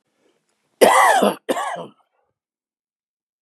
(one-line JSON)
{"cough_length": "3.4 s", "cough_amplitude": 32570, "cough_signal_mean_std_ratio": 0.36, "survey_phase": "beta (2021-08-13 to 2022-03-07)", "age": "65+", "gender": "Male", "wearing_mask": "No", "symptom_cough_any": true, "smoker_status": "Never smoked", "respiratory_condition_asthma": false, "respiratory_condition_other": false, "recruitment_source": "REACT", "submission_delay": "2 days", "covid_test_result": "Negative", "covid_test_method": "RT-qPCR", "influenza_a_test_result": "Negative", "influenza_b_test_result": "Negative"}